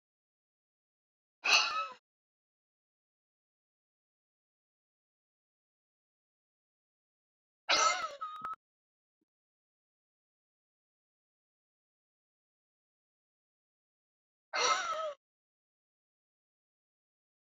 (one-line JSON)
{"exhalation_length": "17.4 s", "exhalation_amplitude": 8138, "exhalation_signal_mean_std_ratio": 0.22, "survey_phase": "beta (2021-08-13 to 2022-03-07)", "age": "45-64", "gender": "Female", "wearing_mask": "No", "symptom_none": true, "smoker_status": "Never smoked", "respiratory_condition_asthma": false, "respiratory_condition_other": false, "recruitment_source": "REACT", "submission_delay": "1 day", "covid_test_result": "Negative", "covid_test_method": "RT-qPCR"}